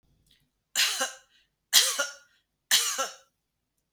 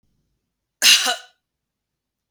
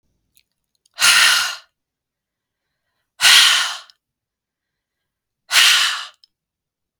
{"three_cough_length": "3.9 s", "three_cough_amplitude": 21876, "three_cough_signal_mean_std_ratio": 0.38, "cough_length": "2.3 s", "cough_amplitude": 32766, "cough_signal_mean_std_ratio": 0.28, "exhalation_length": "7.0 s", "exhalation_amplitude": 32768, "exhalation_signal_mean_std_ratio": 0.37, "survey_phase": "beta (2021-08-13 to 2022-03-07)", "age": "45-64", "gender": "Female", "wearing_mask": "No", "symptom_fatigue": true, "symptom_onset": "12 days", "smoker_status": "Never smoked", "respiratory_condition_asthma": false, "respiratory_condition_other": false, "recruitment_source": "REACT", "submission_delay": "1 day", "covid_test_result": "Negative", "covid_test_method": "RT-qPCR", "influenza_a_test_result": "Negative", "influenza_b_test_result": "Negative"}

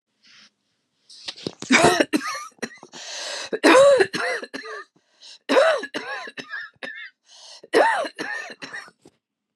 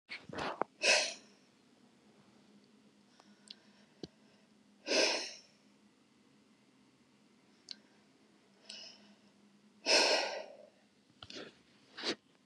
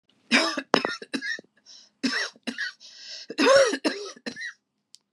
{"three_cough_length": "9.6 s", "three_cough_amplitude": 28372, "three_cough_signal_mean_std_ratio": 0.43, "exhalation_length": "12.5 s", "exhalation_amplitude": 6225, "exhalation_signal_mean_std_ratio": 0.31, "cough_length": "5.1 s", "cough_amplitude": 32767, "cough_signal_mean_std_ratio": 0.44, "survey_phase": "beta (2021-08-13 to 2022-03-07)", "age": "45-64", "gender": "Female", "wearing_mask": "No", "symptom_none": true, "smoker_status": "Never smoked", "respiratory_condition_asthma": false, "respiratory_condition_other": false, "recruitment_source": "REACT", "submission_delay": "1 day", "covid_test_result": "Negative", "covid_test_method": "RT-qPCR", "influenza_a_test_result": "Negative", "influenza_b_test_result": "Negative"}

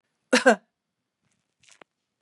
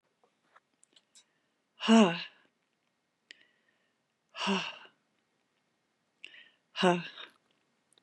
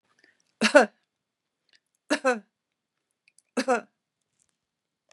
{"cough_length": "2.2 s", "cough_amplitude": 24266, "cough_signal_mean_std_ratio": 0.21, "exhalation_length": "8.0 s", "exhalation_amplitude": 10997, "exhalation_signal_mean_std_ratio": 0.24, "three_cough_length": "5.1 s", "three_cough_amplitude": 29512, "three_cough_signal_mean_std_ratio": 0.23, "survey_phase": "beta (2021-08-13 to 2022-03-07)", "age": "65+", "gender": "Female", "wearing_mask": "No", "symptom_none": true, "smoker_status": "Never smoked", "respiratory_condition_asthma": false, "respiratory_condition_other": false, "recruitment_source": "REACT", "submission_delay": "2 days", "covid_test_result": "Negative", "covid_test_method": "RT-qPCR", "influenza_a_test_result": "Negative", "influenza_b_test_result": "Negative"}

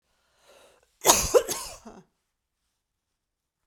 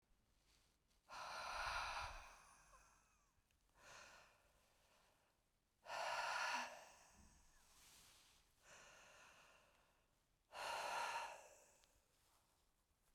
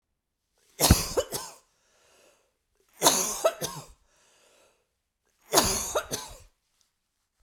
{"cough_length": "3.7 s", "cough_amplitude": 32059, "cough_signal_mean_std_ratio": 0.25, "exhalation_length": "13.1 s", "exhalation_amplitude": 769, "exhalation_signal_mean_std_ratio": 0.46, "three_cough_length": "7.4 s", "three_cough_amplitude": 22727, "three_cough_signal_mean_std_ratio": 0.33, "survey_phase": "beta (2021-08-13 to 2022-03-07)", "age": "45-64", "gender": "Female", "wearing_mask": "No", "symptom_sore_throat": true, "symptom_diarrhoea": true, "symptom_headache": true, "symptom_onset": "3 days", "smoker_status": "Ex-smoker", "respiratory_condition_asthma": true, "respiratory_condition_other": false, "recruitment_source": "Test and Trace", "submission_delay": "1 day", "covid_test_result": "Positive", "covid_test_method": "RT-qPCR", "covid_ct_value": 36.9, "covid_ct_gene": "N gene"}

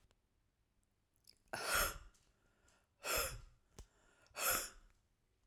{"exhalation_length": "5.5 s", "exhalation_amplitude": 2280, "exhalation_signal_mean_std_ratio": 0.37, "survey_phase": "beta (2021-08-13 to 2022-03-07)", "age": "45-64", "gender": "Female", "wearing_mask": "No", "symptom_runny_or_blocked_nose": true, "symptom_sore_throat": true, "symptom_diarrhoea": true, "symptom_fatigue": true, "symptom_headache": true, "symptom_onset": "3 days", "smoker_status": "Never smoked", "respiratory_condition_asthma": false, "respiratory_condition_other": false, "recruitment_source": "Test and Trace", "submission_delay": "1 day", "covid_test_result": "Positive", "covid_test_method": "RT-qPCR", "covid_ct_value": 26.8, "covid_ct_gene": "ORF1ab gene"}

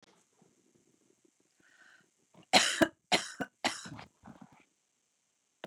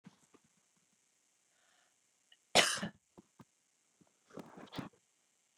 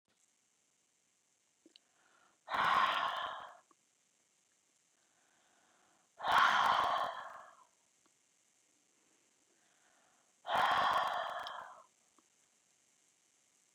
{"three_cough_length": "5.7 s", "three_cough_amplitude": 12196, "three_cough_signal_mean_std_ratio": 0.24, "cough_length": "5.6 s", "cough_amplitude": 10268, "cough_signal_mean_std_ratio": 0.19, "exhalation_length": "13.7 s", "exhalation_amplitude": 4844, "exhalation_signal_mean_std_ratio": 0.36, "survey_phase": "beta (2021-08-13 to 2022-03-07)", "age": "45-64", "gender": "Female", "wearing_mask": "No", "symptom_none": true, "smoker_status": "Never smoked", "respiratory_condition_asthma": false, "respiratory_condition_other": false, "recruitment_source": "REACT", "submission_delay": "2 days", "covid_test_result": "Negative", "covid_test_method": "RT-qPCR", "influenza_a_test_result": "Negative", "influenza_b_test_result": "Negative"}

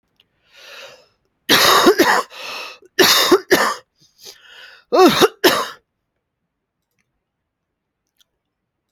{"three_cough_length": "8.9 s", "three_cough_amplitude": 32533, "three_cough_signal_mean_std_ratio": 0.39, "survey_phase": "alpha (2021-03-01 to 2021-08-12)", "age": "45-64", "gender": "Female", "wearing_mask": "No", "symptom_none": true, "smoker_status": "Current smoker (1 to 10 cigarettes per day)", "respiratory_condition_asthma": false, "respiratory_condition_other": false, "recruitment_source": "Test and Trace", "submission_delay": "0 days", "covid_test_result": "Negative", "covid_test_method": "LFT"}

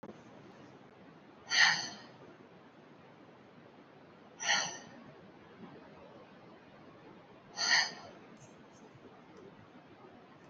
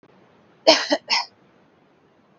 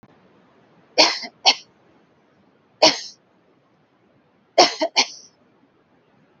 {"exhalation_length": "10.5 s", "exhalation_amplitude": 8712, "exhalation_signal_mean_std_ratio": 0.35, "cough_length": "2.4 s", "cough_amplitude": 32235, "cough_signal_mean_std_ratio": 0.3, "three_cough_length": "6.4 s", "three_cough_amplitude": 31082, "three_cough_signal_mean_std_ratio": 0.26, "survey_phase": "beta (2021-08-13 to 2022-03-07)", "age": "18-44", "gender": "Female", "wearing_mask": "No", "symptom_cough_any": true, "symptom_runny_or_blocked_nose": true, "symptom_sore_throat": true, "symptom_onset": "13 days", "smoker_status": "Never smoked", "respiratory_condition_asthma": false, "respiratory_condition_other": false, "recruitment_source": "REACT", "submission_delay": "0 days", "covid_test_result": "Negative", "covid_test_method": "RT-qPCR"}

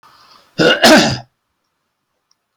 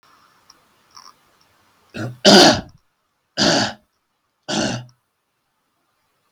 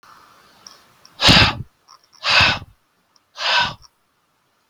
{"cough_length": "2.6 s", "cough_amplitude": 32768, "cough_signal_mean_std_ratio": 0.39, "three_cough_length": "6.3 s", "three_cough_amplitude": 32768, "three_cough_signal_mean_std_ratio": 0.29, "exhalation_length": "4.7 s", "exhalation_amplitude": 32768, "exhalation_signal_mean_std_ratio": 0.37, "survey_phase": "beta (2021-08-13 to 2022-03-07)", "age": "45-64", "gender": "Male", "wearing_mask": "No", "symptom_none": true, "smoker_status": "Ex-smoker", "recruitment_source": "REACT", "submission_delay": "2 days", "covid_test_result": "Negative", "covid_test_method": "RT-qPCR", "influenza_a_test_result": "Negative", "influenza_b_test_result": "Negative"}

